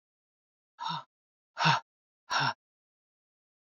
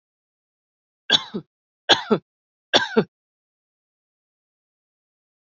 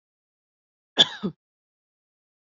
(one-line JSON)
{"exhalation_length": "3.7 s", "exhalation_amplitude": 8813, "exhalation_signal_mean_std_ratio": 0.31, "three_cough_length": "5.5 s", "three_cough_amplitude": 29240, "three_cough_signal_mean_std_ratio": 0.22, "cough_length": "2.5 s", "cough_amplitude": 26974, "cough_signal_mean_std_ratio": 0.17, "survey_phase": "beta (2021-08-13 to 2022-03-07)", "age": "45-64", "gender": "Female", "wearing_mask": "No", "symptom_fatigue": true, "smoker_status": "Never smoked", "respiratory_condition_asthma": false, "respiratory_condition_other": false, "recruitment_source": "REACT", "submission_delay": "1 day", "covid_test_result": "Negative", "covid_test_method": "RT-qPCR"}